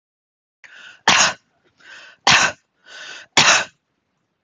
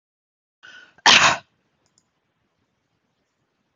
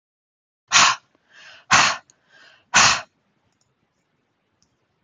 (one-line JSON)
{"three_cough_length": "4.4 s", "three_cough_amplitude": 32554, "three_cough_signal_mean_std_ratio": 0.35, "cough_length": "3.8 s", "cough_amplitude": 32043, "cough_signal_mean_std_ratio": 0.22, "exhalation_length": "5.0 s", "exhalation_amplitude": 32767, "exhalation_signal_mean_std_ratio": 0.3, "survey_phase": "beta (2021-08-13 to 2022-03-07)", "age": "45-64", "gender": "Female", "wearing_mask": "No", "symptom_none": true, "smoker_status": "Ex-smoker", "respiratory_condition_asthma": false, "respiratory_condition_other": false, "recruitment_source": "REACT", "submission_delay": "7 days", "covid_test_result": "Negative", "covid_test_method": "RT-qPCR"}